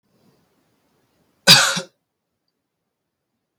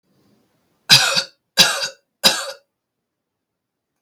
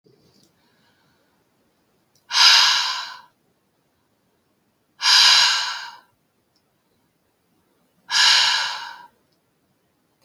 cough_length: 3.6 s
cough_amplitude: 32587
cough_signal_mean_std_ratio: 0.21
three_cough_length: 4.0 s
three_cough_amplitude: 32587
three_cough_signal_mean_std_ratio: 0.32
exhalation_length: 10.2 s
exhalation_amplitude: 30514
exhalation_signal_mean_std_ratio: 0.36
survey_phase: beta (2021-08-13 to 2022-03-07)
age: 18-44
gender: Male
wearing_mask: 'No'
symptom_none: true
smoker_status: Never smoked
respiratory_condition_asthma: true
respiratory_condition_other: false
recruitment_source: REACT
submission_delay: 1 day
covid_test_result: Negative
covid_test_method: RT-qPCR
influenza_a_test_result: Negative
influenza_b_test_result: Negative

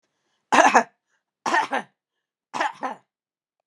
three_cough_length: 3.7 s
three_cough_amplitude: 32196
three_cough_signal_mean_std_ratio: 0.33
survey_phase: beta (2021-08-13 to 2022-03-07)
age: 45-64
gender: Female
wearing_mask: 'No'
symptom_none: true
smoker_status: Never smoked
respiratory_condition_asthma: false
respiratory_condition_other: false
recruitment_source: REACT
submission_delay: 6 days
covid_test_result: Negative
covid_test_method: RT-qPCR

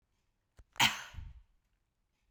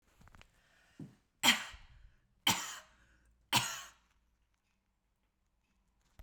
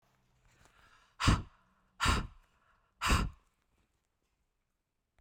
cough_length: 2.3 s
cough_amplitude: 8590
cough_signal_mean_std_ratio: 0.24
three_cough_length: 6.2 s
three_cough_amplitude: 8338
three_cough_signal_mean_std_ratio: 0.25
exhalation_length: 5.2 s
exhalation_amplitude: 7036
exhalation_signal_mean_std_ratio: 0.3
survey_phase: beta (2021-08-13 to 2022-03-07)
age: 18-44
gender: Female
wearing_mask: 'No'
symptom_none: true
smoker_status: Ex-smoker
respiratory_condition_asthma: false
respiratory_condition_other: false
recruitment_source: REACT
submission_delay: 1 day
covid_test_result: Negative
covid_test_method: RT-qPCR
influenza_a_test_result: Negative
influenza_b_test_result: Negative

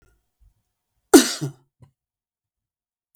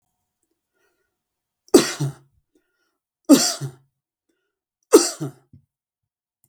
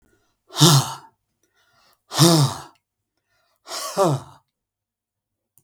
cough_length: 3.2 s
cough_amplitude: 32768
cough_signal_mean_std_ratio: 0.17
three_cough_length: 6.5 s
three_cough_amplitude: 32768
three_cough_signal_mean_std_ratio: 0.23
exhalation_length: 5.6 s
exhalation_amplitude: 32768
exhalation_signal_mean_std_ratio: 0.33
survey_phase: beta (2021-08-13 to 2022-03-07)
age: 65+
gender: Male
wearing_mask: 'No'
symptom_none: true
smoker_status: Never smoked
respiratory_condition_asthma: false
respiratory_condition_other: false
recruitment_source: REACT
submission_delay: 2 days
covid_test_result: Negative
covid_test_method: RT-qPCR
influenza_a_test_result: Negative
influenza_b_test_result: Negative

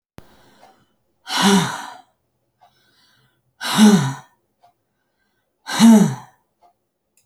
exhalation_length: 7.3 s
exhalation_amplitude: 29374
exhalation_signal_mean_std_ratio: 0.33
survey_phase: alpha (2021-03-01 to 2021-08-12)
age: 65+
gender: Female
wearing_mask: 'No'
symptom_none: true
smoker_status: Ex-smoker
respiratory_condition_asthma: false
respiratory_condition_other: false
recruitment_source: REACT
submission_delay: 1 day
covid_test_result: Negative
covid_test_method: RT-qPCR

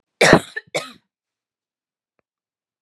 cough_length: 2.8 s
cough_amplitude: 32768
cough_signal_mean_std_ratio: 0.23
survey_phase: beta (2021-08-13 to 2022-03-07)
age: 18-44
gender: Female
wearing_mask: 'No'
symptom_sore_throat: true
symptom_fatigue: true
symptom_headache: true
symptom_other: true
smoker_status: Ex-smoker
respiratory_condition_asthma: false
respiratory_condition_other: false
recruitment_source: Test and Trace
submission_delay: 2 days
covid_test_result: Positive
covid_test_method: LFT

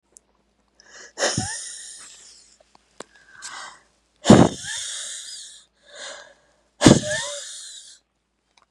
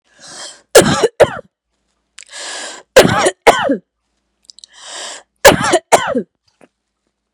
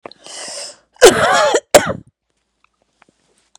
exhalation_length: 8.7 s
exhalation_amplitude: 32768
exhalation_signal_mean_std_ratio: 0.28
three_cough_length: 7.3 s
three_cough_amplitude: 32768
three_cough_signal_mean_std_ratio: 0.37
cough_length: 3.6 s
cough_amplitude: 32768
cough_signal_mean_std_ratio: 0.36
survey_phase: beta (2021-08-13 to 2022-03-07)
age: 45-64
gender: Female
wearing_mask: 'No'
symptom_cough_any: true
symptom_runny_or_blocked_nose: true
symptom_sore_throat: true
symptom_onset: 3 days
smoker_status: Ex-smoker
respiratory_condition_asthma: true
respiratory_condition_other: false
recruitment_source: Test and Trace
submission_delay: 2 days
covid_test_result: Negative
covid_test_method: RT-qPCR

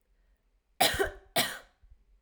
cough_length: 2.2 s
cough_amplitude: 9086
cough_signal_mean_std_ratio: 0.36
survey_phase: alpha (2021-03-01 to 2021-08-12)
age: 18-44
gender: Female
wearing_mask: 'No'
symptom_cough_any: true
symptom_fatigue: true
symptom_change_to_sense_of_smell_or_taste: true
symptom_loss_of_taste: true
smoker_status: Never smoked
respiratory_condition_asthma: false
respiratory_condition_other: false
recruitment_source: Test and Trace
submission_delay: 3 days
covid_test_method: RT-qPCR
covid_ct_value: 38.1
covid_ct_gene: N gene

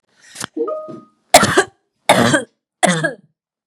three_cough_length: 3.7 s
three_cough_amplitude: 32768
three_cough_signal_mean_std_ratio: 0.42
survey_phase: beta (2021-08-13 to 2022-03-07)
age: 18-44
gender: Female
wearing_mask: 'No'
symptom_none: true
symptom_onset: 4 days
smoker_status: Ex-smoker
respiratory_condition_asthma: false
respiratory_condition_other: false
recruitment_source: REACT
submission_delay: 1 day
covid_test_result: Negative
covid_test_method: RT-qPCR
influenza_a_test_result: Negative
influenza_b_test_result: Negative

